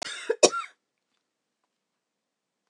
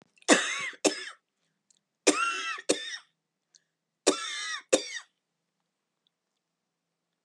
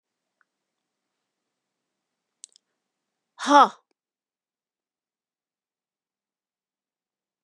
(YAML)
cough_length: 2.7 s
cough_amplitude: 27717
cough_signal_mean_std_ratio: 0.21
three_cough_length: 7.2 s
three_cough_amplitude: 21760
three_cough_signal_mean_std_ratio: 0.33
exhalation_length: 7.4 s
exhalation_amplitude: 26930
exhalation_signal_mean_std_ratio: 0.13
survey_phase: beta (2021-08-13 to 2022-03-07)
age: 45-64
gender: Female
wearing_mask: 'No'
symptom_fatigue: true
symptom_other: true
smoker_status: Never smoked
respiratory_condition_asthma: true
respiratory_condition_other: false
recruitment_source: Test and Trace
submission_delay: 2 days
covid_test_result: Negative
covid_test_method: RT-qPCR